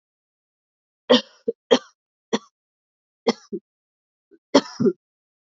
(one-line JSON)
{"cough_length": "5.5 s", "cough_amplitude": 27510, "cough_signal_mean_std_ratio": 0.23, "survey_phase": "alpha (2021-03-01 to 2021-08-12)", "age": "18-44", "gender": "Female", "wearing_mask": "No", "symptom_cough_any": true, "symptom_new_continuous_cough": true, "symptom_shortness_of_breath": true, "symptom_fatigue": true, "symptom_fever_high_temperature": true, "symptom_headache": true, "symptom_change_to_sense_of_smell_or_taste": true, "symptom_loss_of_taste": true, "symptom_onset": "3 days", "smoker_status": "Current smoker (e-cigarettes or vapes only)", "respiratory_condition_asthma": false, "respiratory_condition_other": false, "recruitment_source": "Test and Trace", "submission_delay": "1 day", "covid_test_result": "Positive", "covid_test_method": "RT-qPCR"}